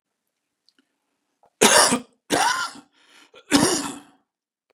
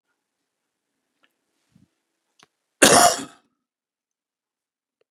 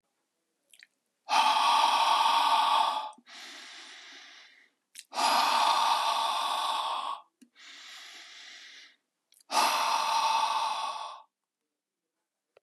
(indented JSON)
{
  "three_cough_length": "4.7 s",
  "three_cough_amplitude": 32469,
  "three_cough_signal_mean_std_ratio": 0.36,
  "cough_length": "5.1 s",
  "cough_amplitude": 32684,
  "cough_signal_mean_std_ratio": 0.2,
  "exhalation_length": "12.6 s",
  "exhalation_amplitude": 8775,
  "exhalation_signal_mean_std_ratio": 0.6,
  "survey_phase": "beta (2021-08-13 to 2022-03-07)",
  "age": "65+",
  "gender": "Male",
  "wearing_mask": "No",
  "symptom_runny_or_blocked_nose": true,
  "symptom_onset": "4 days",
  "smoker_status": "Never smoked",
  "respiratory_condition_asthma": true,
  "respiratory_condition_other": false,
  "recruitment_source": "REACT",
  "submission_delay": "2 days",
  "covid_test_result": "Negative",
  "covid_test_method": "RT-qPCR",
  "influenza_a_test_result": "Negative",
  "influenza_b_test_result": "Negative"
}